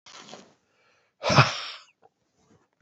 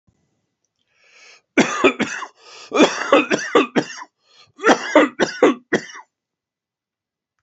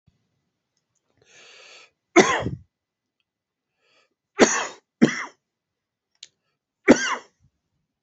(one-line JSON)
{"exhalation_length": "2.8 s", "exhalation_amplitude": 27010, "exhalation_signal_mean_std_ratio": 0.26, "cough_length": "7.4 s", "cough_amplitude": 28393, "cough_signal_mean_std_ratio": 0.39, "three_cough_length": "8.0 s", "three_cough_amplitude": 30385, "three_cough_signal_mean_std_ratio": 0.24, "survey_phase": "beta (2021-08-13 to 2022-03-07)", "age": "45-64", "gender": "Male", "wearing_mask": "No", "symptom_cough_any": true, "symptom_runny_or_blocked_nose": true, "symptom_shortness_of_breath": true, "symptom_sore_throat": true, "symptom_fatigue": true, "symptom_headache": true, "smoker_status": "Ex-smoker", "respiratory_condition_asthma": false, "respiratory_condition_other": false, "recruitment_source": "Test and Trace", "submission_delay": "2 days", "covid_test_result": "Positive", "covid_test_method": "RT-qPCR"}